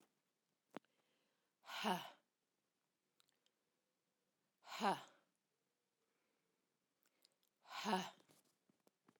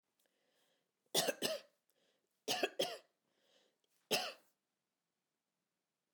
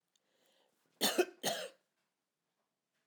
{"exhalation_length": "9.2 s", "exhalation_amplitude": 1764, "exhalation_signal_mean_std_ratio": 0.24, "three_cough_length": "6.1 s", "three_cough_amplitude": 3431, "three_cough_signal_mean_std_ratio": 0.29, "cough_length": "3.1 s", "cough_amplitude": 4153, "cough_signal_mean_std_ratio": 0.28, "survey_phase": "alpha (2021-03-01 to 2021-08-12)", "age": "45-64", "gender": "Female", "wearing_mask": "No", "symptom_none": true, "smoker_status": "Current smoker (1 to 10 cigarettes per day)", "respiratory_condition_asthma": false, "respiratory_condition_other": false, "recruitment_source": "REACT", "submission_delay": "2 days", "covid_test_result": "Negative", "covid_test_method": "RT-qPCR"}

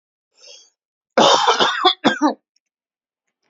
{"three_cough_length": "3.5 s", "three_cough_amplitude": 28978, "three_cough_signal_mean_std_ratio": 0.42, "survey_phase": "alpha (2021-03-01 to 2021-08-12)", "age": "45-64", "gender": "Male", "wearing_mask": "No", "symptom_none": true, "smoker_status": "Never smoked", "respiratory_condition_asthma": false, "respiratory_condition_other": false, "recruitment_source": "REACT", "submission_delay": "3 days", "covid_test_result": "Negative", "covid_test_method": "RT-qPCR"}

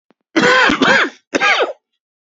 {"three_cough_length": "2.3 s", "three_cough_amplitude": 32767, "three_cough_signal_mean_std_ratio": 0.6, "survey_phase": "beta (2021-08-13 to 2022-03-07)", "age": "18-44", "gender": "Male", "wearing_mask": "No", "symptom_cough_any": true, "symptom_new_continuous_cough": true, "symptom_runny_or_blocked_nose": true, "symptom_sore_throat": true, "symptom_fatigue": true, "symptom_headache": true, "symptom_onset": "3 days", "smoker_status": "Never smoked", "respiratory_condition_asthma": false, "respiratory_condition_other": false, "recruitment_source": "Test and Trace", "submission_delay": "2 days", "covid_test_result": "Positive", "covid_test_method": "RT-qPCR", "covid_ct_value": 22.5, "covid_ct_gene": "ORF1ab gene", "covid_ct_mean": 23.1, "covid_viral_load": "26000 copies/ml", "covid_viral_load_category": "Low viral load (10K-1M copies/ml)"}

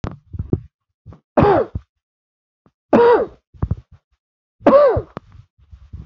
{"three_cough_length": "6.1 s", "three_cough_amplitude": 27594, "three_cough_signal_mean_std_ratio": 0.38, "survey_phase": "beta (2021-08-13 to 2022-03-07)", "age": "18-44", "gender": "Male", "wearing_mask": "No", "symptom_shortness_of_breath": true, "symptom_sore_throat": true, "symptom_fatigue": true, "symptom_headache": true, "symptom_onset": "3 days", "smoker_status": "Never smoked", "respiratory_condition_asthma": false, "respiratory_condition_other": false, "recruitment_source": "Test and Trace", "submission_delay": "-2 days", "covid_test_result": "Positive", "covid_test_method": "RT-qPCR", "covid_ct_value": 22.4, "covid_ct_gene": "ORF1ab gene", "covid_ct_mean": 22.6, "covid_viral_load": "39000 copies/ml", "covid_viral_load_category": "Low viral load (10K-1M copies/ml)"}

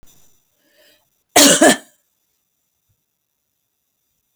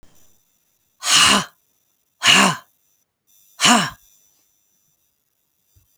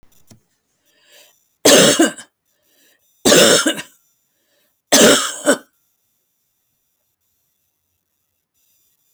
{"cough_length": "4.4 s", "cough_amplitude": 32666, "cough_signal_mean_std_ratio": 0.25, "exhalation_length": "6.0 s", "exhalation_amplitude": 32768, "exhalation_signal_mean_std_ratio": 0.33, "three_cough_length": "9.1 s", "three_cough_amplitude": 32767, "three_cough_signal_mean_std_ratio": 0.32, "survey_phase": "beta (2021-08-13 to 2022-03-07)", "age": "65+", "gender": "Female", "wearing_mask": "No", "symptom_none": true, "smoker_status": "Never smoked", "respiratory_condition_asthma": false, "respiratory_condition_other": false, "recruitment_source": "REACT", "submission_delay": "1 day", "covid_test_result": "Negative", "covid_test_method": "RT-qPCR"}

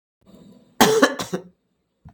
{"cough_length": "2.1 s", "cough_amplitude": 32766, "cough_signal_mean_std_ratio": 0.35, "survey_phase": "beta (2021-08-13 to 2022-03-07)", "age": "45-64", "gender": "Female", "wearing_mask": "No", "symptom_none": true, "smoker_status": "Ex-smoker", "respiratory_condition_asthma": false, "respiratory_condition_other": false, "recruitment_source": "REACT", "submission_delay": "1 day", "covid_test_result": "Negative", "covid_test_method": "RT-qPCR"}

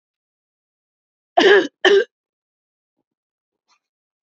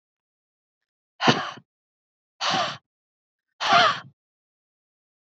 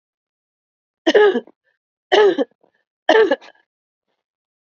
{"cough_length": "4.3 s", "cough_amplitude": 27721, "cough_signal_mean_std_ratio": 0.28, "exhalation_length": "5.2 s", "exhalation_amplitude": 23210, "exhalation_signal_mean_std_ratio": 0.31, "three_cough_length": "4.6 s", "three_cough_amplitude": 29155, "three_cough_signal_mean_std_ratio": 0.35, "survey_phase": "beta (2021-08-13 to 2022-03-07)", "age": "18-44", "gender": "Female", "wearing_mask": "No", "symptom_none": true, "smoker_status": "Never smoked", "respiratory_condition_asthma": false, "respiratory_condition_other": false, "recruitment_source": "REACT", "submission_delay": "3 days", "covid_test_result": "Negative", "covid_test_method": "RT-qPCR", "influenza_a_test_result": "Negative", "influenza_b_test_result": "Negative"}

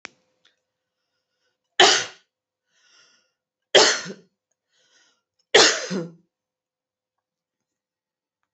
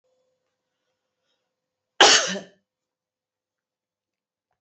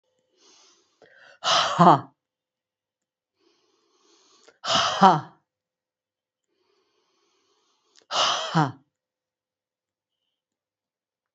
{"three_cough_length": "8.5 s", "three_cough_amplitude": 30297, "three_cough_signal_mean_std_ratio": 0.24, "cough_length": "4.6 s", "cough_amplitude": 32767, "cough_signal_mean_std_ratio": 0.19, "exhalation_length": "11.3 s", "exhalation_amplitude": 27408, "exhalation_signal_mean_std_ratio": 0.26, "survey_phase": "alpha (2021-03-01 to 2021-08-12)", "age": "45-64", "gender": "Female", "wearing_mask": "No", "symptom_none": true, "symptom_onset": "3 days", "smoker_status": "Never smoked", "respiratory_condition_asthma": false, "respiratory_condition_other": false, "recruitment_source": "Test and Trace", "submission_delay": "2 days", "covid_test_result": "Positive", "covid_test_method": "RT-qPCR"}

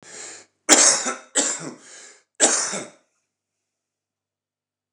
{"three_cough_length": "4.9 s", "three_cough_amplitude": 29204, "three_cough_signal_mean_std_ratio": 0.35, "survey_phase": "beta (2021-08-13 to 2022-03-07)", "age": "45-64", "gender": "Male", "wearing_mask": "No", "symptom_none": true, "symptom_onset": "12 days", "smoker_status": "Current smoker (11 or more cigarettes per day)", "respiratory_condition_asthma": false, "respiratory_condition_other": false, "recruitment_source": "REACT", "submission_delay": "1 day", "covid_test_result": "Negative", "covid_test_method": "RT-qPCR"}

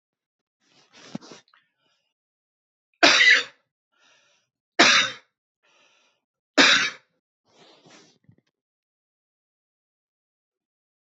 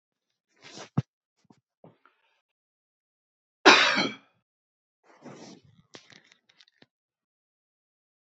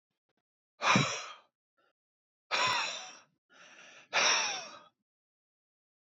{"three_cough_length": "11.0 s", "three_cough_amplitude": 27661, "three_cough_signal_mean_std_ratio": 0.24, "cough_length": "8.3 s", "cough_amplitude": 29641, "cough_signal_mean_std_ratio": 0.18, "exhalation_length": "6.1 s", "exhalation_amplitude": 7471, "exhalation_signal_mean_std_ratio": 0.38, "survey_phase": "beta (2021-08-13 to 2022-03-07)", "age": "45-64", "gender": "Male", "wearing_mask": "No", "symptom_none": true, "smoker_status": "Never smoked", "respiratory_condition_asthma": false, "respiratory_condition_other": false, "recruitment_source": "REACT", "submission_delay": "1 day", "covid_test_result": "Negative", "covid_test_method": "RT-qPCR"}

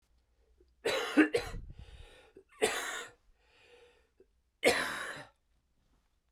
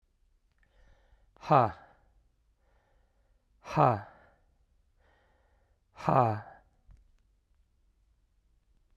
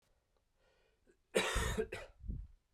{"three_cough_length": "6.3 s", "three_cough_amplitude": 7702, "three_cough_signal_mean_std_ratio": 0.36, "exhalation_length": "9.0 s", "exhalation_amplitude": 12113, "exhalation_signal_mean_std_ratio": 0.24, "cough_length": "2.7 s", "cough_amplitude": 4036, "cough_signal_mean_std_ratio": 0.43, "survey_phase": "beta (2021-08-13 to 2022-03-07)", "age": "18-44", "gender": "Male", "wearing_mask": "No", "symptom_cough_any": true, "symptom_new_continuous_cough": true, "symptom_runny_or_blocked_nose": true, "symptom_sore_throat": true, "symptom_fatigue": true, "symptom_fever_high_temperature": true, "symptom_onset": "3 days", "smoker_status": "Never smoked", "respiratory_condition_asthma": false, "respiratory_condition_other": false, "recruitment_source": "Test and Trace", "submission_delay": "1 day", "covid_test_result": "Positive", "covid_test_method": "RT-qPCR"}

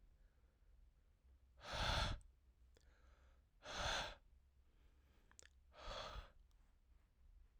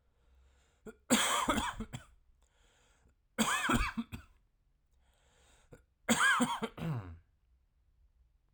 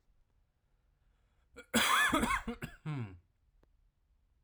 {"exhalation_length": "7.6 s", "exhalation_amplitude": 1281, "exhalation_signal_mean_std_ratio": 0.42, "three_cough_length": "8.5 s", "three_cough_amplitude": 7297, "three_cough_signal_mean_std_ratio": 0.42, "cough_length": "4.4 s", "cough_amplitude": 5119, "cough_signal_mean_std_ratio": 0.4, "survey_phase": "alpha (2021-03-01 to 2021-08-12)", "age": "18-44", "gender": "Male", "wearing_mask": "No", "symptom_cough_any": true, "symptom_abdominal_pain": true, "symptom_fatigue": true, "symptom_headache": true, "smoker_status": "Never smoked", "respiratory_condition_asthma": false, "respiratory_condition_other": false, "recruitment_source": "Test and Trace", "submission_delay": "1 day", "covid_test_result": "Positive", "covid_test_method": "RT-qPCR", "covid_ct_value": 15.5, "covid_ct_gene": "ORF1ab gene", "covid_ct_mean": 15.9, "covid_viral_load": "6200000 copies/ml", "covid_viral_load_category": "High viral load (>1M copies/ml)"}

